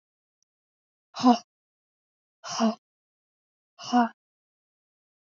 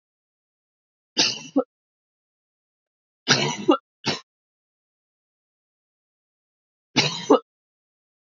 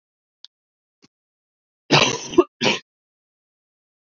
{"exhalation_length": "5.3 s", "exhalation_amplitude": 13649, "exhalation_signal_mean_std_ratio": 0.25, "three_cough_length": "8.3 s", "three_cough_amplitude": 26382, "three_cough_signal_mean_std_ratio": 0.26, "cough_length": "4.0 s", "cough_amplitude": 28481, "cough_signal_mean_std_ratio": 0.26, "survey_phase": "beta (2021-08-13 to 2022-03-07)", "age": "18-44", "gender": "Female", "wearing_mask": "No", "symptom_cough_any": true, "symptom_sore_throat": true, "symptom_fever_high_temperature": true, "symptom_headache": true, "smoker_status": "Never smoked", "respiratory_condition_asthma": false, "respiratory_condition_other": false, "recruitment_source": "Test and Trace", "submission_delay": "1 day", "covid_test_result": "Positive", "covid_test_method": "RT-qPCR", "covid_ct_value": 30.9, "covid_ct_gene": "N gene"}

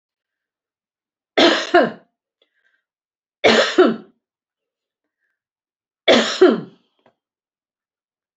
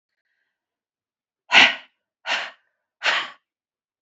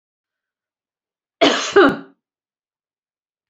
{"three_cough_length": "8.4 s", "three_cough_amplitude": 29096, "three_cough_signal_mean_std_ratio": 0.31, "exhalation_length": "4.0 s", "exhalation_amplitude": 28975, "exhalation_signal_mean_std_ratio": 0.27, "cough_length": "3.5 s", "cough_amplitude": 32768, "cough_signal_mean_std_ratio": 0.28, "survey_phase": "beta (2021-08-13 to 2022-03-07)", "age": "45-64", "gender": "Female", "wearing_mask": "No", "symptom_none": true, "smoker_status": "Never smoked", "respiratory_condition_asthma": false, "respiratory_condition_other": false, "recruitment_source": "REACT", "submission_delay": "1 day", "covid_test_result": "Negative", "covid_test_method": "RT-qPCR"}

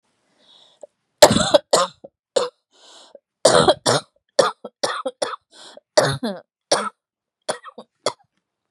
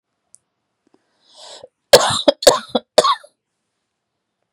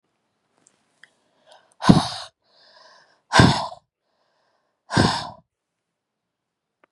{"three_cough_length": "8.7 s", "three_cough_amplitude": 32768, "three_cough_signal_mean_std_ratio": 0.33, "cough_length": "4.5 s", "cough_amplitude": 32768, "cough_signal_mean_std_ratio": 0.26, "exhalation_length": "6.9 s", "exhalation_amplitude": 32768, "exhalation_signal_mean_std_ratio": 0.25, "survey_phase": "beta (2021-08-13 to 2022-03-07)", "age": "45-64", "gender": "Female", "wearing_mask": "No", "symptom_cough_any": true, "symptom_runny_or_blocked_nose": true, "symptom_fatigue": true, "symptom_headache": true, "symptom_onset": "4 days", "smoker_status": "Never smoked", "respiratory_condition_asthma": false, "respiratory_condition_other": false, "recruitment_source": "Test and Trace", "submission_delay": "1 day", "covid_test_result": "Positive", "covid_test_method": "RT-qPCR", "covid_ct_value": 23.6, "covid_ct_gene": "ORF1ab gene"}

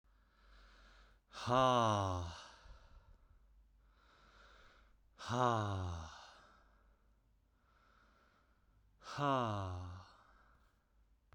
{"exhalation_length": "11.3 s", "exhalation_amplitude": 3991, "exhalation_signal_mean_std_ratio": 0.39, "survey_phase": "beta (2021-08-13 to 2022-03-07)", "age": "18-44", "gender": "Male", "wearing_mask": "No", "symptom_cough_any": true, "symptom_runny_or_blocked_nose": true, "symptom_fatigue": true, "symptom_fever_high_temperature": true, "symptom_headache": true, "symptom_onset": "3 days", "smoker_status": "Never smoked", "respiratory_condition_asthma": false, "respiratory_condition_other": false, "recruitment_source": "Test and Trace", "submission_delay": "1 day", "covid_test_result": "Positive", "covid_test_method": "RT-qPCR", "covid_ct_value": 16.4, "covid_ct_gene": "ORF1ab gene", "covid_ct_mean": 17.1, "covid_viral_load": "2500000 copies/ml", "covid_viral_load_category": "High viral load (>1M copies/ml)"}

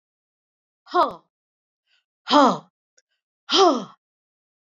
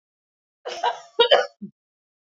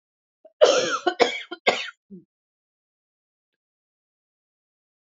{"exhalation_length": "4.8 s", "exhalation_amplitude": 26252, "exhalation_signal_mean_std_ratio": 0.29, "cough_length": "2.4 s", "cough_amplitude": 27531, "cough_signal_mean_std_ratio": 0.31, "three_cough_length": "5.0 s", "three_cough_amplitude": 25749, "three_cough_signal_mean_std_ratio": 0.28, "survey_phase": "beta (2021-08-13 to 2022-03-07)", "age": "65+", "gender": "Female", "wearing_mask": "No", "symptom_cough_any": true, "symptom_runny_or_blocked_nose": true, "symptom_sore_throat": true, "symptom_fatigue": true, "symptom_other": true, "symptom_onset": "5 days", "smoker_status": "Never smoked", "respiratory_condition_asthma": false, "respiratory_condition_other": false, "recruitment_source": "Test and Trace", "submission_delay": "2 days", "covid_test_result": "Positive", "covid_test_method": "RT-qPCR", "covid_ct_value": 18.2, "covid_ct_gene": "N gene"}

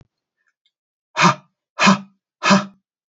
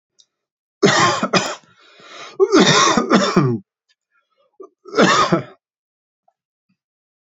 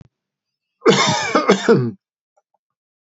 {"exhalation_length": "3.2 s", "exhalation_amplitude": 30675, "exhalation_signal_mean_std_ratio": 0.33, "three_cough_length": "7.3 s", "three_cough_amplitude": 32768, "three_cough_signal_mean_std_ratio": 0.46, "cough_length": "3.1 s", "cough_amplitude": 27860, "cough_signal_mean_std_ratio": 0.44, "survey_phase": "beta (2021-08-13 to 2022-03-07)", "age": "45-64", "gender": "Male", "wearing_mask": "No", "symptom_cough_any": true, "symptom_fatigue": true, "symptom_headache": true, "symptom_onset": "13 days", "smoker_status": "Ex-smoker", "respiratory_condition_asthma": false, "respiratory_condition_other": false, "recruitment_source": "REACT", "submission_delay": "1 day", "covid_test_result": "Negative", "covid_test_method": "RT-qPCR", "influenza_a_test_result": "Negative", "influenza_b_test_result": "Negative"}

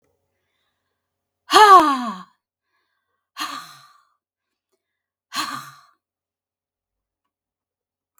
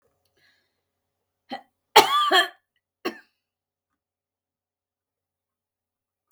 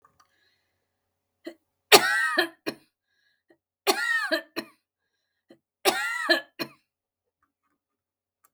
{"exhalation_length": "8.2 s", "exhalation_amplitude": 32768, "exhalation_signal_mean_std_ratio": 0.22, "cough_length": "6.3 s", "cough_amplitude": 32766, "cough_signal_mean_std_ratio": 0.21, "three_cough_length": "8.5 s", "three_cough_amplitude": 32768, "three_cough_signal_mean_std_ratio": 0.3, "survey_phase": "beta (2021-08-13 to 2022-03-07)", "age": "65+", "gender": "Female", "wearing_mask": "No", "symptom_none": true, "smoker_status": "Never smoked", "respiratory_condition_asthma": false, "respiratory_condition_other": false, "recruitment_source": "REACT", "submission_delay": "2 days", "covid_test_result": "Negative", "covid_test_method": "RT-qPCR", "influenza_a_test_result": "Negative", "influenza_b_test_result": "Negative"}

